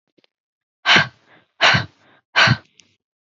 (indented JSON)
{
  "exhalation_length": "3.2 s",
  "exhalation_amplitude": 27968,
  "exhalation_signal_mean_std_ratio": 0.35,
  "survey_phase": "beta (2021-08-13 to 2022-03-07)",
  "age": "18-44",
  "gender": "Female",
  "wearing_mask": "No",
  "symptom_fatigue": true,
  "symptom_headache": true,
  "smoker_status": "Never smoked",
  "respiratory_condition_asthma": false,
  "respiratory_condition_other": false,
  "recruitment_source": "Test and Trace",
  "submission_delay": "2 days",
  "covid_test_result": "Positive",
  "covid_test_method": "ePCR"
}